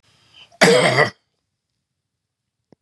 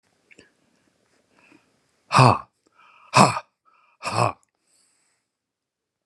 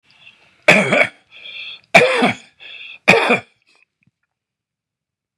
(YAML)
cough_length: 2.8 s
cough_amplitude: 32707
cough_signal_mean_std_ratio: 0.33
exhalation_length: 6.1 s
exhalation_amplitude: 32214
exhalation_signal_mean_std_ratio: 0.24
three_cough_length: 5.4 s
three_cough_amplitude: 32768
three_cough_signal_mean_std_ratio: 0.36
survey_phase: beta (2021-08-13 to 2022-03-07)
age: 65+
gender: Male
wearing_mask: 'No'
symptom_none: true
smoker_status: Ex-smoker
respiratory_condition_asthma: false
respiratory_condition_other: false
recruitment_source: REACT
submission_delay: 18 days
covid_test_result: Negative
covid_test_method: RT-qPCR
influenza_a_test_result: Negative
influenza_b_test_result: Negative